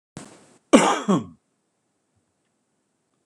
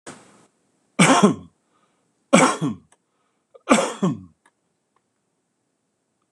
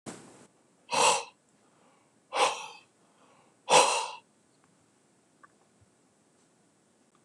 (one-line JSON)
{"cough_length": "3.3 s", "cough_amplitude": 26028, "cough_signal_mean_std_ratio": 0.27, "three_cough_length": "6.3 s", "three_cough_amplitude": 26028, "three_cough_signal_mean_std_ratio": 0.32, "exhalation_length": "7.2 s", "exhalation_amplitude": 16233, "exhalation_signal_mean_std_ratio": 0.29, "survey_phase": "beta (2021-08-13 to 2022-03-07)", "age": "65+", "gender": "Male", "wearing_mask": "No", "symptom_none": true, "smoker_status": "Ex-smoker", "respiratory_condition_asthma": false, "respiratory_condition_other": false, "recruitment_source": "REACT", "submission_delay": "3 days", "covid_test_result": "Negative", "covid_test_method": "RT-qPCR", "influenza_a_test_result": "Negative", "influenza_b_test_result": "Negative"}